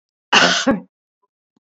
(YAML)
cough_length: 1.6 s
cough_amplitude: 31052
cough_signal_mean_std_ratio: 0.41
survey_phase: alpha (2021-03-01 to 2021-08-12)
age: 65+
gender: Female
wearing_mask: 'No'
symptom_none: true
smoker_status: Current smoker (1 to 10 cigarettes per day)
respiratory_condition_asthma: false
respiratory_condition_other: false
recruitment_source: REACT
submission_delay: 1 day
covid_test_result: Negative
covid_test_method: RT-qPCR